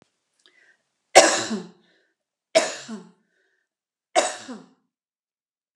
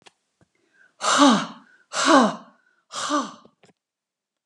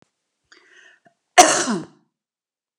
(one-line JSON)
{"three_cough_length": "5.8 s", "three_cough_amplitude": 32768, "three_cough_signal_mean_std_ratio": 0.25, "exhalation_length": "4.5 s", "exhalation_amplitude": 28281, "exhalation_signal_mean_std_ratio": 0.38, "cough_length": "2.8 s", "cough_amplitude": 32768, "cough_signal_mean_std_ratio": 0.25, "survey_phase": "alpha (2021-03-01 to 2021-08-12)", "age": "65+", "gender": "Female", "wearing_mask": "No", "symptom_none": true, "smoker_status": "Ex-smoker", "respiratory_condition_asthma": false, "respiratory_condition_other": false, "recruitment_source": "REACT", "submission_delay": "1 day", "covid_test_result": "Negative", "covid_test_method": "RT-qPCR"}